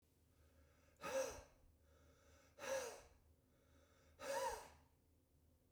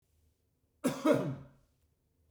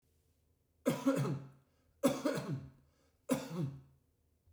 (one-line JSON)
{"exhalation_length": "5.7 s", "exhalation_amplitude": 728, "exhalation_signal_mean_std_ratio": 0.43, "cough_length": "2.3 s", "cough_amplitude": 6842, "cough_signal_mean_std_ratio": 0.34, "three_cough_length": "4.5 s", "three_cough_amplitude": 4395, "three_cough_signal_mean_std_ratio": 0.45, "survey_phase": "beta (2021-08-13 to 2022-03-07)", "age": "45-64", "gender": "Male", "wearing_mask": "No", "symptom_none": true, "smoker_status": "Never smoked", "respiratory_condition_asthma": false, "respiratory_condition_other": false, "recruitment_source": "REACT", "submission_delay": "2 days", "covid_test_result": "Negative", "covid_test_method": "RT-qPCR", "influenza_a_test_result": "Negative", "influenza_b_test_result": "Negative"}